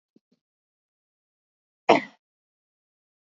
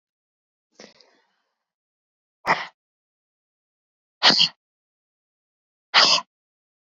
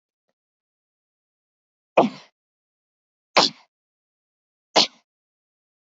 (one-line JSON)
{"cough_length": "3.2 s", "cough_amplitude": 26409, "cough_signal_mean_std_ratio": 0.13, "exhalation_length": "7.0 s", "exhalation_amplitude": 26546, "exhalation_signal_mean_std_ratio": 0.23, "three_cough_length": "5.8 s", "three_cough_amplitude": 28702, "three_cough_signal_mean_std_ratio": 0.18, "survey_phase": "beta (2021-08-13 to 2022-03-07)", "age": "18-44", "gender": "Female", "wearing_mask": "Yes", "symptom_runny_or_blocked_nose": true, "symptom_sore_throat": true, "symptom_headache": true, "smoker_status": "Never smoked", "respiratory_condition_asthma": false, "respiratory_condition_other": false, "recruitment_source": "Test and Trace", "submission_delay": "0 days", "covid_test_result": "Positive", "covid_test_method": "LFT"}